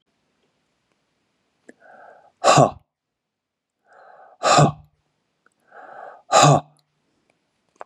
{"exhalation_length": "7.9 s", "exhalation_amplitude": 32768, "exhalation_signal_mean_std_ratio": 0.27, "survey_phase": "beta (2021-08-13 to 2022-03-07)", "age": "65+", "gender": "Male", "wearing_mask": "No", "symptom_none": true, "smoker_status": "Never smoked", "respiratory_condition_asthma": false, "respiratory_condition_other": false, "recruitment_source": "REACT", "submission_delay": "3 days", "covid_test_result": "Negative", "covid_test_method": "RT-qPCR", "influenza_a_test_result": "Negative", "influenza_b_test_result": "Negative"}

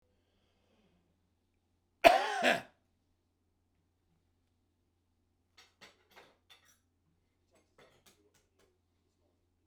{"cough_length": "9.7 s", "cough_amplitude": 17527, "cough_signal_mean_std_ratio": 0.16, "survey_phase": "beta (2021-08-13 to 2022-03-07)", "age": "65+", "gender": "Male", "wearing_mask": "No", "symptom_none": true, "smoker_status": "Ex-smoker", "respiratory_condition_asthma": false, "respiratory_condition_other": false, "recruitment_source": "REACT", "submission_delay": "3 days", "covid_test_result": "Negative", "covid_test_method": "RT-qPCR", "influenza_a_test_result": "Negative", "influenza_b_test_result": "Negative"}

